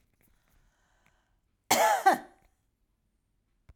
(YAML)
cough_length: 3.8 s
cough_amplitude: 10592
cough_signal_mean_std_ratio: 0.28
survey_phase: beta (2021-08-13 to 2022-03-07)
age: 65+
gender: Female
wearing_mask: 'No'
symptom_none: true
smoker_status: Never smoked
respiratory_condition_asthma: false
respiratory_condition_other: false
recruitment_source: REACT
submission_delay: 2 days
covid_test_result: Negative
covid_test_method: RT-qPCR
influenza_a_test_result: Negative
influenza_b_test_result: Negative